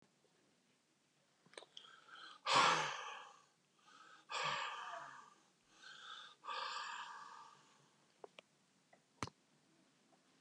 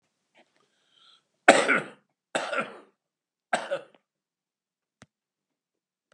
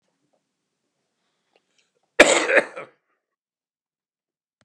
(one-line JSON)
{"exhalation_length": "10.4 s", "exhalation_amplitude": 3373, "exhalation_signal_mean_std_ratio": 0.35, "three_cough_length": "6.1 s", "three_cough_amplitude": 32723, "three_cough_signal_mean_std_ratio": 0.23, "cough_length": "4.6 s", "cough_amplitude": 32768, "cough_signal_mean_std_ratio": 0.21, "survey_phase": "beta (2021-08-13 to 2022-03-07)", "age": "65+", "gender": "Male", "wearing_mask": "No", "symptom_cough_any": true, "smoker_status": "Never smoked", "respiratory_condition_asthma": false, "respiratory_condition_other": false, "recruitment_source": "REACT", "submission_delay": "2 days", "covid_test_result": "Negative", "covid_test_method": "RT-qPCR", "influenza_a_test_result": "Negative", "influenza_b_test_result": "Negative"}